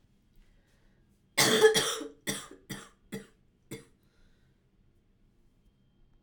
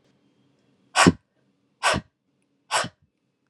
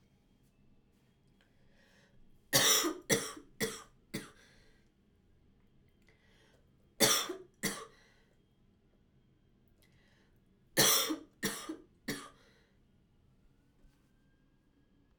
{
  "cough_length": "6.2 s",
  "cough_amplitude": 11619,
  "cough_signal_mean_std_ratio": 0.28,
  "exhalation_length": "3.5 s",
  "exhalation_amplitude": 25559,
  "exhalation_signal_mean_std_ratio": 0.26,
  "three_cough_length": "15.2 s",
  "three_cough_amplitude": 8306,
  "three_cough_signal_mean_std_ratio": 0.29,
  "survey_phase": "alpha (2021-03-01 to 2021-08-12)",
  "age": "18-44",
  "gender": "Female",
  "wearing_mask": "No",
  "symptom_diarrhoea": true,
  "smoker_status": "Never smoked",
  "respiratory_condition_asthma": false,
  "respiratory_condition_other": false,
  "recruitment_source": "Test and Trace",
  "submission_delay": "2 days",
  "covid_test_result": "Positive",
  "covid_test_method": "RT-qPCR",
  "covid_ct_value": 18.6,
  "covid_ct_gene": "ORF1ab gene"
}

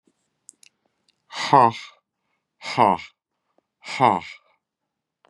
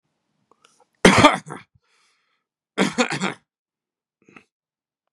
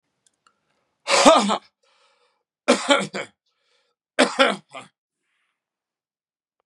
{
  "exhalation_length": "5.3 s",
  "exhalation_amplitude": 29336,
  "exhalation_signal_mean_std_ratio": 0.27,
  "cough_length": "5.1 s",
  "cough_amplitude": 32768,
  "cough_signal_mean_std_ratio": 0.25,
  "three_cough_length": "6.7 s",
  "three_cough_amplitude": 32767,
  "three_cough_signal_mean_std_ratio": 0.3,
  "survey_phase": "beta (2021-08-13 to 2022-03-07)",
  "age": "45-64",
  "gender": "Male",
  "wearing_mask": "No",
  "symptom_cough_any": true,
  "symptom_runny_or_blocked_nose": true,
  "symptom_headache": true,
  "symptom_onset": "5 days",
  "smoker_status": "Never smoked",
  "respiratory_condition_asthma": false,
  "respiratory_condition_other": false,
  "recruitment_source": "REACT",
  "submission_delay": "1 day",
  "covid_test_result": "Positive",
  "covid_test_method": "RT-qPCR",
  "covid_ct_value": 23.5,
  "covid_ct_gene": "E gene",
  "influenza_a_test_result": "Negative",
  "influenza_b_test_result": "Negative"
}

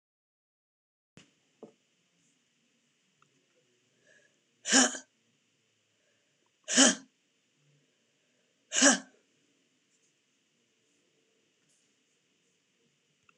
{
  "exhalation_length": "13.4 s",
  "exhalation_amplitude": 18656,
  "exhalation_signal_mean_std_ratio": 0.18,
  "survey_phase": "alpha (2021-03-01 to 2021-08-12)",
  "age": "45-64",
  "gender": "Female",
  "wearing_mask": "No",
  "symptom_cough_any": true,
  "symptom_fatigue": true,
  "symptom_headache": true,
  "symptom_onset": "12 days",
  "smoker_status": "Never smoked",
  "respiratory_condition_asthma": false,
  "respiratory_condition_other": true,
  "recruitment_source": "REACT",
  "submission_delay": "2 days",
  "covid_test_result": "Negative",
  "covid_test_method": "RT-qPCR"
}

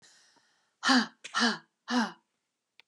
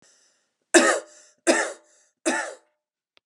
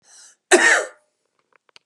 {
  "exhalation_length": "2.9 s",
  "exhalation_amplitude": 9288,
  "exhalation_signal_mean_std_ratio": 0.38,
  "three_cough_length": "3.3 s",
  "three_cough_amplitude": 31862,
  "three_cough_signal_mean_std_ratio": 0.34,
  "cough_length": "1.9 s",
  "cough_amplitude": 32469,
  "cough_signal_mean_std_ratio": 0.34,
  "survey_phase": "beta (2021-08-13 to 2022-03-07)",
  "age": "45-64",
  "gender": "Female",
  "wearing_mask": "No",
  "symptom_none": true,
  "smoker_status": "Ex-smoker",
  "respiratory_condition_asthma": false,
  "respiratory_condition_other": false,
  "recruitment_source": "REACT",
  "submission_delay": "2 days",
  "covid_test_result": "Negative",
  "covid_test_method": "RT-qPCR",
  "influenza_a_test_result": "Negative",
  "influenza_b_test_result": "Negative"
}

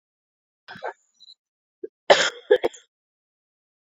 {
  "cough_length": "3.8 s",
  "cough_amplitude": 27910,
  "cough_signal_mean_std_ratio": 0.22,
  "survey_phase": "beta (2021-08-13 to 2022-03-07)",
  "age": "18-44",
  "gender": "Female",
  "wearing_mask": "No",
  "symptom_cough_any": true,
  "symptom_new_continuous_cough": true,
  "symptom_runny_or_blocked_nose": true,
  "symptom_shortness_of_breath": true,
  "symptom_sore_throat": true,
  "symptom_fatigue": true,
  "symptom_fever_high_temperature": true,
  "symptom_headache": true,
  "symptom_change_to_sense_of_smell_or_taste": true,
  "symptom_loss_of_taste": true,
  "smoker_status": "Ex-smoker",
  "respiratory_condition_asthma": false,
  "respiratory_condition_other": false,
  "recruitment_source": "Test and Trace",
  "submission_delay": "1 day",
  "covid_test_result": "Positive",
  "covid_test_method": "RT-qPCR",
  "covid_ct_value": 15.0,
  "covid_ct_gene": "ORF1ab gene",
  "covid_ct_mean": 15.2,
  "covid_viral_load": "10000000 copies/ml",
  "covid_viral_load_category": "High viral load (>1M copies/ml)"
}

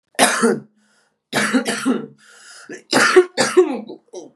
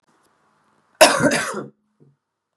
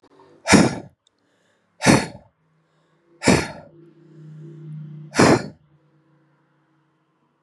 {
  "three_cough_length": "4.4 s",
  "three_cough_amplitude": 32767,
  "three_cough_signal_mean_std_ratio": 0.51,
  "cough_length": "2.6 s",
  "cough_amplitude": 32768,
  "cough_signal_mean_std_ratio": 0.32,
  "exhalation_length": "7.4 s",
  "exhalation_amplitude": 32539,
  "exhalation_signal_mean_std_ratio": 0.3,
  "survey_phase": "beta (2021-08-13 to 2022-03-07)",
  "age": "18-44",
  "gender": "Female",
  "wearing_mask": "No",
  "symptom_cough_any": true,
  "symptom_runny_or_blocked_nose": true,
  "symptom_sore_throat": true,
  "symptom_abdominal_pain": true,
  "symptom_fatigue": true,
  "symptom_headache": true,
  "smoker_status": "Current smoker (1 to 10 cigarettes per day)",
  "respiratory_condition_asthma": false,
  "respiratory_condition_other": false,
  "recruitment_source": "Test and Trace",
  "submission_delay": "2 days",
  "covid_test_result": "Positive",
  "covid_test_method": "ePCR"
}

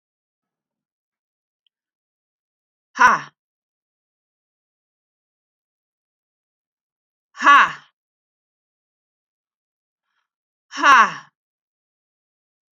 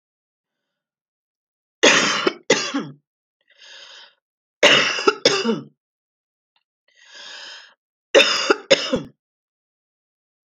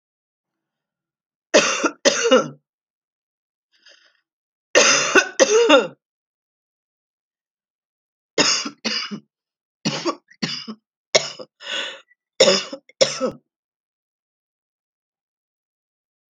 {
  "exhalation_length": "12.7 s",
  "exhalation_amplitude": 29386,
  "exhalation_signal_mean_std_ratio": 0.19,
  "three_cough_length": "10.5 s",
  "three_cough_amplitude": 32768,
  "three_cough_signal_mean_std_ratio": 0.34,
  "cough_length": "16.4 s",
  "cough_amplitude": 31721,
  "cough_signal_mean_std_ratio": 0.33,
  "survey_phase": "beta (2021-08-13 to 2022-03-07)",
  "age": "18-44",
  "gender": "Female",
  "wearing_mask": "No",
  "symptom_cough_any": true,
  "symptom_runny_or_blocked_nose": true,
  "symptom_sore_throat": true,
  "symptom_abdominal_pain": true,
  "symptom_fatigue": true,
  "symptom_headache": true,
  "symptom_onset": "6 days",
  "smoker_status": "Never smoked",
  "respiratory_condition_asthma": false,
  "respiratory_condition_other": false,
  "recruitment_source": "Test and Trace",
  "submission_delay": "1 day",
  "covid_test_result": "Positive",
  "covid_test_method": "RT-qPCR"
}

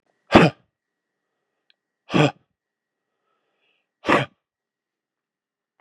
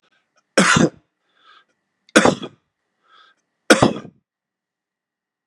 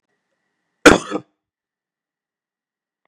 {
  "exhalation_length": "5.8 s",
  "exhalation_amplitude": 32768,
  "exhalation_signal_mean_std_ratio": 0.22,
  "three_cough_length": "5.5 s",
  "three_cough_amplitude": 32768,
  "three_cough_signal_mean_std_ratio": 0.27,
  "cough_length": "3.1 s",
  "cough_amplitude": 32768,
  "cough_signal_mean_std_ratio": 0.17,
  "survey_phase": "beta (2021-08-13 to 2022-03-07)",
  "age": "65+",
  "gender": "Male",
  "wearing_mask": "No",
  "symptom_cough_any": true,
  "symptom_runny_or_blocked_nose": true,
  "symptom_change_to_sense_of_smell_or_taste": true,
  "symptom_onset": "5 days",
  "smoker_status": "Never smoked",
  "respiratory_condition_asthma": true,
  "respiratory_condition_other": false,
  "recruitment_source": "Test and Trace",
  "submission_delay": "2 days",
  "covid_test_result": "Positive",
  "covid_test_method": "RT-qPCR",
  "covid_ct_value": 14.0,
  "covid_ct_gene": "ORF1ab gene",
  "covid_ct_mean": 14.4,
  "covid_viral_load": "19000000 copies/ml",
  "covid_viral_load_category": "High viral load (>1M copies/ml)"
}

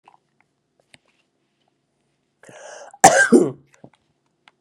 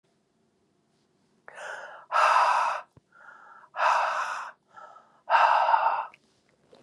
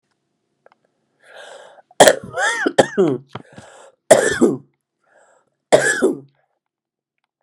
{
  "cough_length": "4.6 s",
  "cough_amplitude": 32768,
  "cough_signal_mean_std_ratio": 0.24,
  "exhalation_length": "6.8 s",
  "exhalation_amplitude": 14910,
  "exhalation_signal_mean_std_ratio": 0.48,
  "three_cough_length": "7.4 s",
  "three_cough_amplitude": 32768,
  "three_cough_signal_mean_std_ratio": 0.34,
  "survey_phase": "beta (2021-08-13 to 2022-03-07)",
  "age": "65+",
  "gender": "Female",
  "wearing_mask": "No",
  "symptom_sore_throat": true,
  "symptom_fatigue": true,
  "symptom_headache": true,
  "symptom_other": true,
  "symptom_onset": "5 days",
  "smoker_status": "Never smoked",
  "respiratory_condition_asthma": false,
  "respiratory_condition_other": true,
  "recruitment_source": "Test and Trace",
  "submission_delay": "2 days",
  "covid_test_result": "Positive",
  "covid_test_method": "ePCR"
}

